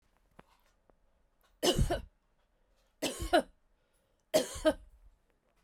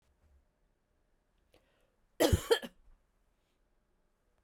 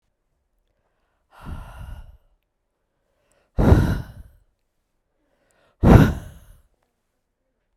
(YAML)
three_cough_length: 5.6 s
three_cough_amplitude: 7148
three_cough_signal_mean_std_ratio: 0.31
cough_length: 4.4 s
cough_amplitude: 7913
cough_signal_mean_std_ratio: 0.2
exhalation_length: 7.8 s
exhalation_amplitude: 32768
exhalation_signal_mean_std_ratio: 0.25
survey_phase: beta (2021-08-13 to 2022-03-07)
age: 18-44
gender: Female
wearing_mask: 'No'
symptom_none: true
smoker_status: Never smoked
respiratory_condition_asthma: false
respiratory_condition_other: false
recruitment_source: REACT
submission_delay: 2 days
covid_test_result: Negative
covid_test_method: RT-qPCR
influenza_a_test_result: Negative
influenza_b_test_result: Negative